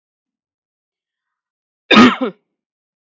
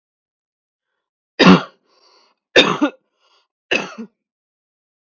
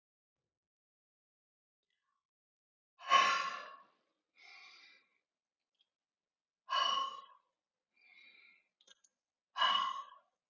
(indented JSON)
{
  "cough_length": "3.1 s",
  "cough_amplitude": 32768,
  "cough_signal_mean_std_ratio": 0.25,
  "three_cough_length": "5.1 s",
  "three_cough_amplitude": 32767,
  "three_cough_signal_mean_std_ratio": 0.26,
  "exhalation_length": "10.5 s",
  "exhalation_amplitude": 5381,
  "exhalation_signal_mean_std_ratio": 0.29,
  "survey_phase": "beta (2021-08-13 to 2022-03-07)",
  "age": "18-44",
  "gender": "Female",
  "wearing_mask": "No",
  "symptom_none": true,
  "smoker_status": "Never smoked",
  "respiratory_condition_asthma": false,
  "respiratory_condition_other": false,
  "recruitment_source": "Test and Trace",
  "submission_delay": "1 day",
  "covid_test_result": "Negative",
  "covid_test_method": "RT-qPCR"
}